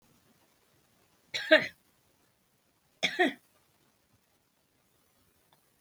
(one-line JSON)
{"cough_length": "5.8 s", "cough_amplitude": 16785, "cough_signal_mean_std_ratio": 0.2, "survey_phase": "alpha (2021-03-01 to 2021-08-12)", "age": "65+", "gender": "Female", "wearing_mask": "Yes", "symptom_prefer_not_to_say": true, "smoker_status": "Current smoker (e-cigarettes or vapes only)", "respiratory_condition_asthma": true, "respiratory_condition_other": false, "recruitment_source": "REACT", "submission_delay": "3 days", "covid_test_result": "Negative", "covid_test_method": "RT-qPCR"}